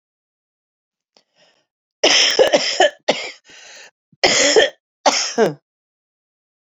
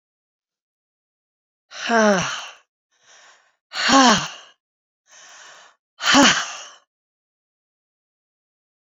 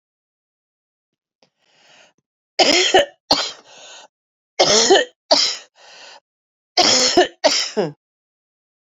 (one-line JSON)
{"cough_length": "6.7 s", "cough_amplitude": 32768, "cough_signal_mean_std_ratio": 0.41, "exhalation_length": "8.9 s", "exhalation_amplitude": 28821, "exhalation_signal_mean_std_ratio": 0.32, "three_cough_length": "9.0 s", "three_cough_amplitude": 31748, "three_cough_signal_mean_std_ratio": 0.39, "survey_phase": "beta (2021-08-13 to 2022-03-07)", "age": "45-64", "gender": "Female", "wearing_mask": "No", "symptom_cough_any": true, "symptom_runny_or_blocked_nose": true, "symptom_shortness_of_breath": true, "symptom_sore_throat": true, "symptom_fatigue": true, "symptom_onset": "3 days", "smoker_status": "Never smoked", "respiratory_condition_asthma": false, "respiratory_condition_other": false, "recruitment_source": "Test and Trace", "submission_delay": "1 day", "covid_test_result": "Positive", "covid_test_method": "RT-qPCR", "covid_ct_value": 24.8, "covid_ct_gene": "N gene"}